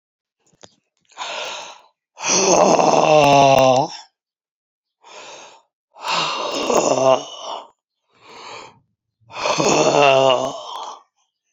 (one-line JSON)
{"exhalation_length": "11.5 s", "exhalation_amplitude": 29483, "exhalation_signal_mean_std_ratio": 0.49, "survey_phase": "alpha (2021-03-01 to 2021-08-12)", "age": "45-64", "gender": "Female", "wearing_mask": "No", "symptom_cough_any": true, "symptom_shortness_of_breath": true, "symptom_fatigue": true, "symptom_headache": true, "smoker_status": "Ex-smoker", "respiratory_condition_asthma": false, "respiratory_condition_other": false, "recruitment_source": "REACT", "submission_delay": "1 day", "covid_test_result": "Negative", "covid_test_method": "RT-qPCR"}